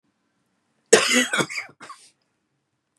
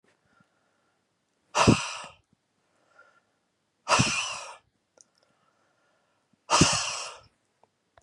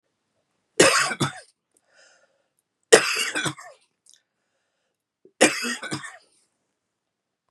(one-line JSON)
{"cough_length": "3.0 s", "cough_amplitude": 32309, "cough_signal_mean_std_ratio": 0.31, "exhalation_length": "8.0 s", "exhalation_amplitude": 17746, "exhalation_signal_mean_std_ratio": 0.3, "three_cough_length": "7.5 s", "three_cough_amplitude": 32768, "three_cough_signal_mean_std_ratio": 0.29, "survey_phase": "beta (2021-08-13 to 2022-03-07)", "age": "45-64", "gender": "Male", "wearing_mask": "No", "symptom_cough_any": true, "symptom_sore_throat": true, "symptom_diarrhoea": true, "symptom_headache": true, "symptom_change_to_sense_of_smell_or_taste": true, "smoker_status": "Ex-smoker", "respiratory_condition_asthma": false, "respiratory_condition_other": false, "recruitment_source": "Test and Trace", "submission_delay": "2 days", "covid_test_result": "Positive", "covid_test_method": "LFT"}